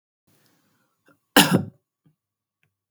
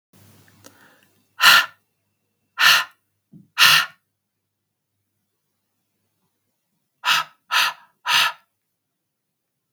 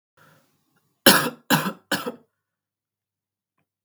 {
  "cough_length": "2.9 s",
  "cough_amplitude": 32766,
  "cough_signal_mean_std_ratio": 0.21,
  "exhalation_length": "9.7 s",
  "exhalation_amplitude": 32767,
  "exhalation_signal_mean_std_ratio": 0.29,
  "three_cough_length": "3.8 s",
  "three_cough_amplitude": 32768,
  "three_cough_signal_mean_std_ratio": 0.26,
  "survey_phase": "beta (2021-08-13 to 2022-03-07)",
  "age": "18-44",
  "gender": "Female",
  "wearing_mask": "No",
  "symptom_runny_or_blocked_nose": true,
  "smoker_status": "Never smoked",
  "respiratory_condition_asthma": false,
  "respiratory_condition_other": false,
  "recruitment_source": "Test and Trace",
  "submission_delay": "2 days",
  "covid_test_result": "Positive",
  "covid_test_method": "RT-qPCR",
  "covid_ct_value": 25.9,
  "covid_ct_gene": "N gene"
}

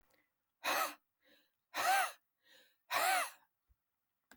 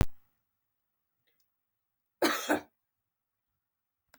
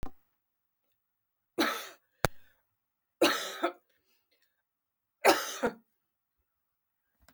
{
  "exhalation_length": "4.4 s",
  "exhalation_amplitude": 2805,
  "exhalation_signal_mean_std_ratio": 0.4,
  "cough_length": "4.2 s",
  "cough_amplitude": 10472,
  "cough_signal_mean_std_ratio": 0.25,
  "three_cough_length": "7.3 s",
  "three_cough_amplitude": 16477,
  "three_cough_signal_mean_std_ratio": 0.28,
  "survey_phase": "beta (2021-08-13 to 2022-03-07)",
  "age": "45-64",
  "gender": "Female",
  "wearing_mask": "No",
  "symptom_none": true,
  "smoker_status": "Never smoked",
  "respiratory_condition_asthma": false,
  "respiratory_condition_other": false,
  "recruitment_source": "REACT",
  "submission_delay": "1 day",
  "covid_test_result": "Negative",
  "covid_test_method": "RT-qPCR",
  "influenza_a_test_result": "Negative",
  "influenza_b_test_result": "Negative"
}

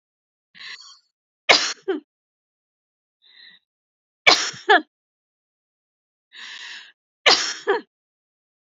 {
  "three_cough_length": "8.7 s",
  "three_cough_amplitude": 32768,
  "three_cough_signal_mean_std_ratio": 0.26,
  "survey_phase": "beta (2021-08-13 to 2022-03-07)",
  "age": "45-64",
  "gender": "Female",
  "wearing_mask": "No",
  "symptom_none": true,
  "symptom_onset": "13 days",
  "smoker_status": "Ex-smoker",
  "respiratory_condition_asthma": false,
  "respiratory_condition_other": true,
  "recruitment_source": "REACT",
  "submission_delay": "15 days",
  "covid_test_result": "Negative",
  "covid_test_method": "RT-qPCR",
  "influenza_a_test_result": "Negative",
  "influenza_b_test_result": "Negative"
}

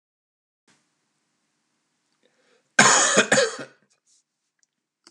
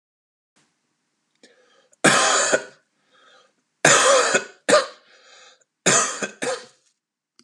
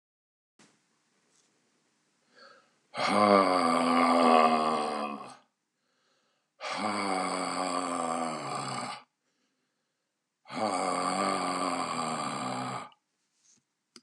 {
  "cough_length": "5.1 s",
  "cough_amplitude": 31378,
  "cough_signal_mean_std_ratio": 0.29,
  "three_cough_length": "7.4 s",
  "three_cough_amplitude": 31962,
  "three_cough_signal_mean_std_ratio": 0.39,
  "exhalation_length": "14.0 s",
  "exhalation_amplitude": 12958,
  "exhalation_signal_mean_std_ratio": 0.54,
  "survey_phase": "beta (2021-08-13 to 2022-03-07)",
  "age": "45-64",
  "gender": "Male",
  "wearing_mask": "No",
  "symptom_cough_any": true,
  "symptom_runny_or_blocked_nose": true,
  "symptom_sore_throat": true,
  "symptom_headache": true,
  "symptom_onset": "3 days",
  "smoker_status": "Never smoked",
  "respiratory_condition_asthma": false,
  "respiratory_condition_other": false,
  "recruitment_source": "Test and Trace",
  "submission_delay": "1 day",
  "covid_test_result": "Positive",
  "covid_test_method": "RT-qPCR",
  "covid_ct_value": 16.8,
  "covid_ct_gene": "N gene",
  "covid_ct_mean": 16.8,
  "covid_viral_load": "3100000 copies/ml",
  "covid_viral_load_category": "High viral load (>1M copies/ml)"
}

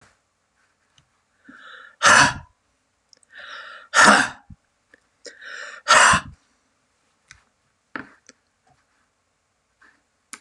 {
  "exhalation_length": "10.4 s",
  "exhalation_amplitude": 32767,
  "exhalation_signal_mean_std_ratio": 0.26,
  "survey_phase": "beta (2021-08-13 to 2022-03-07)",
  "age": "65+",
  "gender": "Male",
  "wearing_mask": "No",
  "symptom_cough_any": true,
  "symptom_headache": true,
  "symptom_onset": "3 days",
  "smoker_status": "Ex-smoker",
  "respiratory_condition_asthma": false,
  "respiratory_condition_other": false,
  "recruitment_source": "REACT",
  "submission_delay": "2 days",
  "covid_test_result": "Negative",
  "covid_test_method": "RT-qPCR",
  "influenza_a_test_result": "Negative",
  "influenza_b_test_result": "Negative"
}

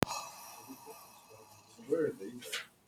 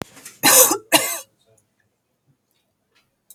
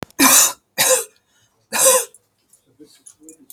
{
  "exhalation_length": "2.9 s",
  "exhalation_amplitude": 14318,
  "exhalation_signal_mean_std_ratio": 0.46,
  "cough_length": "3.3 s",
  "cough_amplitude": 32768,
  "cough_signal_mean_std_ratio": 0.31,
  "three_cough_length": "3.5 s",
  "three_cough_amplitude": 32768,
  "three_cough_signal_mean_std_ratio": 0.41,
  "survey_phase": "alpha (2021-03-01 to 2021-08-12)",
  "age": "18-44",
  "gender": "Female",
  "wearing_mask": "No",
  "symptom_none": true,
  "smoker_status": "Never smoked",
  "respiratory_condition_asthma": false,
  "respiratory_condition_other": false,
  "recruitment_source": "REACT",
  "submission_delay": "1 day",
  "covid_test_result": "Negative",
  "covid_test_method": "RT-qPCR"
}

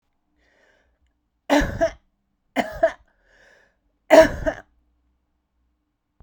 {
  "three_cough_length": "6.2 s",
  "three_cough_amplitude": 32768,
  "three_cough_signal_mean_std_ratio": 0.26,
  "survey_phase": "beta (2021-08-13 to 2022-03-07)",
  "age": "45-64",
  "gender": "Female",
  "wearing_mask": "No",
  "symptom_none": true,
  "symptom_onset": "4 days",
  "smoker_status": "Ex-smoker",
  "respiratory_condition_asthma": false,
  "respiratory_condition_other": false,
  "recruitment_source": "REACT",
  "submission_delay": "3 days",
  "covid_test_result": "Negative",
  "covid_test_method": "RT-qPCR"
}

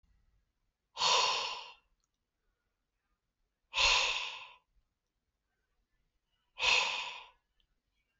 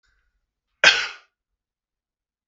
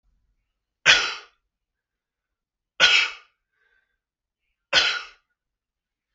{
  "exhalation_length": "8.2 s",
  "exhalation_amplitude": 5762,
  "exhalation_signal_mean_std_ratio": 0.36,
  "cough_length": "2.5 s",
  "cough_amplitude": 32768,
  "cough_signal_mean_std_ratio": 0.21,
  "three_cough_length": "6.1 s",
  "three_cough_amplitude": 32537,
  "three_cough_signal_mean_std_ratio": 0.27,
  "survey_phase": "beta (2021-08-13 to 2022-03-07)",
  "age": "18-44",
  "gender": "Male",
  "wearing_mask": "No",
  "symptom_runny_or_blocked_nose": true,
  "symptom_fatigue": true,
  "symptom_change_to_sense_of_smell_or_taste": true,
  "symptom_loss_of_taste": true,
  "smoker_status": "Never smoked",
  "respiratory_condition_asthma": false,
  "respiratory_condition_other": false,
  "recruitment_source": "Test and Trace",
  "submission_delay": "2 days",
  "covid_test_result": "Positive",
  "covid_test_method": "RT-qPCR",
  "covid_ct_value": 17.7,
  "covid_ct_gene": "ORF1ab gene",
  "covid_ct_mean": 17.9,
  "covid_viral_load": "1300000 copies/ml",
  "covid_viral_load_category": "High viral load (>1M copies/ml)"
}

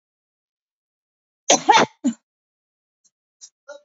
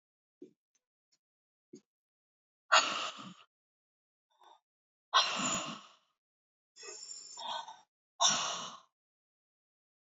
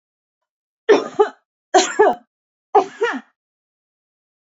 {
  "cough_length": "3.8 s",
  "cough_amplitude": 29243,
  "cough_signal_mean_std_ratio": 0.24,
  "exhalation_length": "10.2 s",
  "exhalation_amplitude": 9908,
  "exhalation_signal_mean_std_ratio": 0.3,
  "three_cough_length": "4.5 s",
  "three_cough_amplitude": 28669,
  "three_cough_signal_mean_std_ratio": 0.32,
  "survey_phase": "beta (2021-08-13 to 2022-03-07)",
  "age": "45-64",
  "gender": "Female",
  "wearing_mask": "No",
  "symptom_cough_any": true,
  "symptom_runny_or_blocked_nose": true,
  "symptom_sore_throat": true,
  "symptom_abdominal_pain": true,
  "symptom_fever_high_temperature": true,
  "symptom_headache": true,
  "symptom_change_to_sense_of_smell_or_taste": true,
  "symptom_loss_of_taste": true,
  "symptom_onset": "3 days",
  "smoker_status": "Current smoker (11 or more cigarettes per day)",
  "respiratory_condition_asthma": false,
  "respiratory_condition_other": false,
  "recruitment_source": "Test and Trace",
  "submission_delay": "2 days",
  "covid_test_result": "Positive",
  "covid_test_method": "RT-qPCR",
  "covid_ct_value": 22.7,
  "covid_ct_gene": "ORF1ab gene",
  "covid_ct_mean": 23.3,
  "covid_viral_load": "23000 copies/ml",
  "covid_viral_load_category": "Low viral load (10K-1M copies/ml)"
}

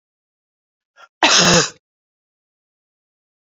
{
  "three_cough_length": "3.6 s",
  "three_cough_amplitude": 31129,
  "three_cough_signal_mean_std_ratio": 0.29,
  "survey_phase": "beta (2021-08-13 to 2022-03-07)",
  "age": "45-64",
  "gender": "Female",
  "wearing_mask": "No",
  "symptom_cough_any": true,
  "symptom_runny_or_blocked_nose": true,
  "symptom_sore_throat": true,
  "symptom_headache": true,
  "symptom_change_to_sense_of_smell_or_taste": true,
  "symptom_onset": "5 days",
  "smoker_status": "Never smoked",
  "respiratory_condition_asthma": false,
  "respiratory_condition_other": false,
  "recruitment_source": "Test and Trace",
  "submission_delay": "2 days",
  "covid_test_result": "Positive",
  "covid_test_method": "RT-qPCR",
  "covid_ct_value": 15.8,
  "covid_ct_gene": "ORF1ab gene",
  "covid_ct_mean": 16.4,
  "covid_viral_load": "4200000 copies/ml",
  "covid_viral_load_category": "High viral load (>1M copies/ml)"
}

